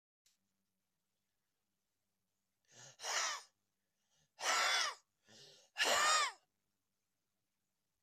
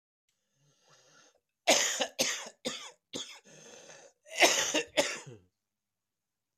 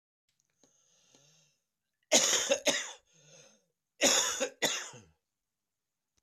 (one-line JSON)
{"exhalation_length": "8.0 s", "exhalation_amplitude": 3260, "exhalation_signal_mean_std_ratio": 0.34, "cough_length": "6.6 s", "cough_amplitude": 13945, "cough_signal_mean_std_ratio": 0.36, "three_cough_length": "6.2 s", "three_cough_amplitude": 13103, "three_cough_signal_mean_std_ratio": 0.35, "survey_phase": "beta (2021-08-13 to 2022-03-07)", "age": "45-64", "gender": "Male", "wearing_mask": "No", "symptom_cough_any": true, "symptom_runny_or_blocked_nose": true, "symptom_onset": "5 days", "smoker_status": "Ex-smoker", "respiratory_condition_asthma": false, "respiratory_condition_other": true, "recruitment_source": "Test and Trace", "submission_delay": "2 days", "covid_test_result": "Positive", "covid_test_method": "LAMP"}